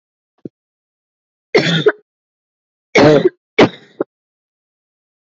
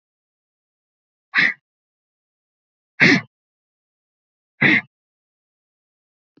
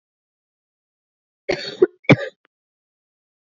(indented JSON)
{
  "three_cough_length": "5.2 s",
  "three_cough_amplitude": 28493,
  "three_cough_signal_mean_std_ratio": 0.31,
  "exhalation_length": "6.4 s",
  "exhalation_amplitude": 28052,
  "exhalation_signal_mean_std_ratio": 0.23,
  "cough_length": "3.4 s",
  "cough_amplitude": 27746,
  "cough_signal_mean_std_ratio": 0.19,
  "survey_phase": "beta (2021-08-13 to 2022-03-07)",
  "age": "45-64",
  "gender": "Female",
  "wearing_mask": "No",
  "symptom_cough_any": true,
  "symptom_runny_or_blocked_nose": true,
  "symptom_sore_throat": true,
  "symptom_abdominal_pain": true,
  "symptom_diarrhoea": true,
  "symptom_fatigue": true,
  "symptom_other": true,
  "smoker_status": "Ex-smoker",
  "respiratory_condition_asthma": false,
  "respiratory_condition_other": false,
  "recruitment_source": "Test and Trace",
  "submission_delay": "2 days",
  "covid_test_result": "Positive",
  "covid_test_method": "RT-qPCR",
  "covid_ct_value": 30.9,
  "covid_ct_gene": "ORF1ab gene"
}